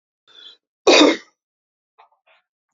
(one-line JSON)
{"cough_length": "2.7 s", "cough_amplitude": 28735, "cough_signal_mean_std_ratio": 0.27, "survey_phase": "beta (2021-08-13 to 2022-03-07)", "age": "65+", "gender": "Male", "wearing_mask": "No", "symptom_cough_any": true, "symptom_sore_throat": true, "smoker_status": "Ex-smoker", "respiratory_condition_asthma": false, "respiratory_condition_other": false, "recruitment_source": "REACT", "submission_delay": "1 day", "covid_test_result": "Positive", "covid_test_method": "RT-qPCR", "covid_ct_value": 21.0, "covid_ct_gene": "E gene", "influenza_a_test_result": "Negative", "influenza_b_test_result": "Negative"}